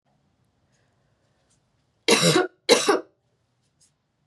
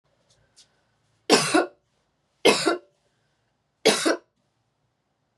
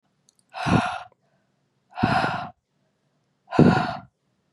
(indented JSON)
{
  "cough_length": "4.3 s",
  "cough_amplitude": 28354,
  "cough_signal_mean_std_ratio": 0.31,
  "three_cough_length": "5.4 s",
  "three_cough_amplitude": 25879,
  "three_cough_signal_mean_std_ratio": 0.31,
  "exhalation_length": "4.5 s",
  "exhalation_amplitude": 28906,
  "exhalation_signal_mean_std_ratio": 0.38,
  "survey_phase": "beta (2021-08-13 to 2022-03-07)",
  "age": "18-44",
  "gender": "Female",
  "wearing_mask": "No",
  "symptom_cough_any": true,
  "symptom_new_continuous_cough": true,
  "symptom_runny_or_blocked_nose": true,
  "symptom_abdominal_pain": true,
  "symptom_fever_high_temperature": true,
  "symptom_headache": true,
  "symptom_onset": "3 days",
  "smoker_status": "Never smoked",
  "respiratory_condition_asthma": false,
  "respiratory_condition_other": false,
  "recruitment_source": "Test and Trace",
  "submission_delay": "2 days",
  "covid_test_result": "Positive",
  "covid_test_method": "RT-qPCR"
}